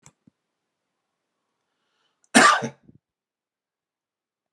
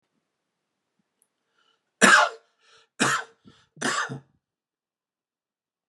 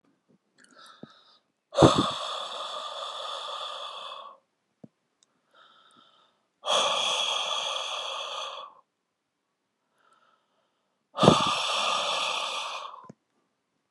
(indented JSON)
{
  "cough_length": "4.5 s",
  "cough_amplitude": 32282,
  "cough_signal_mean_std_ratio": 0.19,
  "three_cough_length": "5.9 s",
  "three_cough_amplitude": 32080,
  "three_cough_signal_mean_std_ratio": 0.26,
  "exhalation_length": "13.9 s",
  "exhalation_amplitude": 30803,
  "exhalation_signal_mean_std_ratio": 0.43,
  "survey_phase": "beta (2021-08-13 to 2022-03-07)",
  "age": "45-64",
  "gender": "Male",
  "wearing_mask": "No",
  "symptom_none": true,
  "smoker_status": "Ex-smoker",
  "respiratory_condition_asthma": false,
  "respiratory_condition_other": false,
  "recruitment_source": "REACT",
  "submission_delay": "3 days",
  "covid_test_result": "Negative",
  "covid_test_method": "RT-qPCR"
}